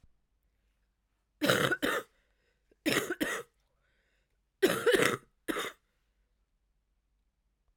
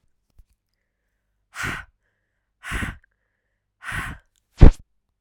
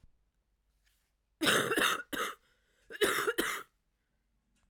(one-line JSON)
{"three_cough_length": "7.8 s", "three_cough_amplitude": 14183, "three_cough_signal_mean_std_ratio": 0.35, "exhalation_length": "5.2 s", "exhalation_amplitude": 32768, "exhalation_signal_mean_std_ratio": 0.17, "cough_length": "4.7 s", "cough_amplitude": 6654, "cough_signal_mean_std_ratio": 0.42, "survey_phase": "alpha (2021-03-01 to 2021-08-12)", "age": "18-44", "gender": "Female", "wearing_mask": "No", "symptom_cough_any": true, "symptom_shortness_of_breath": true, "symptom_abdominal_pain": true, "symptom_diarrhoea": true, "symptom_fatigue": true, "symptom_fever_high_temperature": true, "symptom_headache": true, "symptom_change_to_sense_of_smell_or_taste": true, "symptom_onset": "3 days", "smoker_status": "Never smoked", "respiratory_condition_asthma": true, "respiratory_condition_other": false, "recruitment_source": "Test and Trace", "submission_delay": "2 days", "covid_test_result": "Positive", "covid_test_method": "RT-qPCR"}